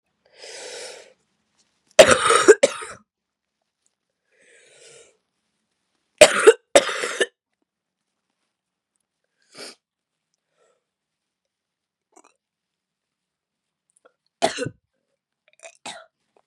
three_cough_length: 16.5 s
three_cough_amplitude: 32768
three_cough_signal_mean_std_ratio: 0.19
survey_phase: beta (2021-08-13 to 2022-03-07)
age: 18-44
gender: Female
wearing_mask: 'No'
symptom_new_continuous_cough: true
symptom_runny_or_blocked_nose: true
symptom_sore_throat: true
smoker_status: Ex-smoker
respiratory_condition_asthma: true
respiratory_condition_other: false
recruitment_source: Test and Trace
submission_delay: 1 day
covid_test_result: Positive
covid_test_method: LFT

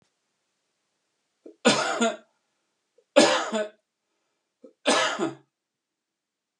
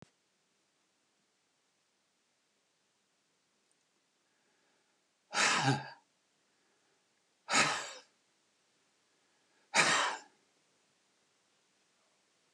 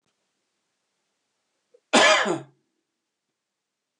three_cough_length: 6.6 s
three_cough_amplitude: 25061
three_cough_signal_mean_std_ratio: 0.33
exhalation_length: 12.5 s
exhalation_amplitude: 8889
exhalation_signal_mean_std_ratio: 0.26
cough_length: 4.0 s
cough_amplitude: 23051
cough_signal_mean_std_ratio: 0.26
survey_phase: beta (2021-08-13 to 2022-03-07)
age: 65+
gender: Male
wearing_mask: 'No'
symptom_none: true
smoker_status: Never smoked
respiratory_condition_asthma: true
respiratory_condition_other: false
recruitment_source: REACT
submission_delay: 5 days
covid_test_result: Negative
covid_test_method: RT-qPCR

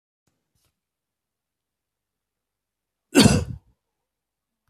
cough_length: 4.7 s
cough_amplitude: 31788
cough_signal_mean_std_ratio: 0.19
survey_phase: beta (2021-08-13 to 2022-03-07)
age: 45-64
gender: Male
wearing_mask: 'No'
symptom_none: true
smoker_status: Never smoked
respiratory_condition_asthma: false
respiratory_condition_other: false
recruitment_source: REACT
submission_delay: 1 day
covid_test_result: Negative
covid_test_method: RT-qPCR
influenza_a_test_result: Negative
influenza_b_test_result: Negative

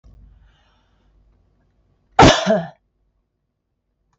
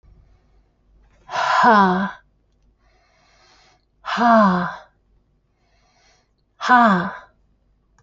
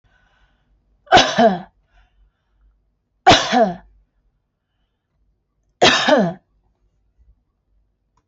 cough_length: 4.2 s
cough_amplitude: 30481
cough_signal_mean_std_ratio: 0.24
exhalation_length: 8.0 s
exhalation_amplitude: 26317
exhalation_signal_mean_std_ratio: 0.39
three_cough_length: 8.3 s
three_cough_amplitude: 31321
three_cough_signal_mean_std_ratio: 0.31
survey_phase: alpha (2021-03-01 to 2021-08-12)
age: 45-64
gender: Female
wearing_mask: 'No'
symptom_none: true
smoker_status: Never smoked
respiratory_condition_asthma: false
respiratory_condition_other: false
recruitment_source: REACT
submission_delay: 3 days
covid_test_result: Negative
covid_test_method: RT-qPCR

